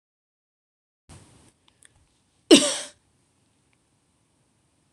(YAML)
cough_length: 4.9 s
cough_amplitude: 26027
cough_signal_mean_std_ratio: 0.16
survey_phase: beta (2021-08-13 to 2022-03-07)
age: 18-44
gender: Female
wearing_mask: 'No'
symptom_runny_or_blocked_nose: true
symptom_fatigue: true
symptom_headache: true
symptom_other: true
symptom_onset: 3 days
smoker_status: Never smoked
respiratory_condition_asthma: false
respiratory_condition_other: false
recruitment_source: Test and Trace
submission_delay: 2 days
covid_test_result: Positive
covid_test_method: ePCR